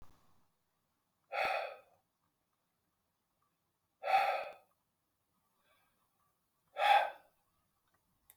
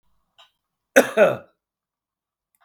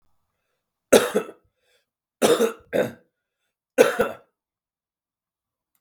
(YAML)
exhalation_length: 8.4 s
exhalation_amplitude: 5110
exhalation_signal_mean_std_ratio: 0.28
cough_length: 2.6 s
cough_amplitude: 32768
cough_signal_mean_std_ratio: 0.25
three_cough_length: 5.8 s
three_cough_amplitude: 32766
three_cough_signal_mean_std_ratio: 0.29
survey_phase: beta (2021-08-13 to 2022-03-07)
age: 45-64
gender: Male
wearing_mask: 'No'
symptom_new_continuous_cough: true
symptom_runny_or_blocked_nose: true
symptom_sore_throat: true
symptom_fatigue: true
symptom_onset: 2 days
smoker_status: Ex-smoker
respiratory_condition_asthma: false
respiratory_condition_other: true
recruitment_source: Test and Trace
submission_delay: 1 day
covid_test_result: Positive
covid_test_method: ePCR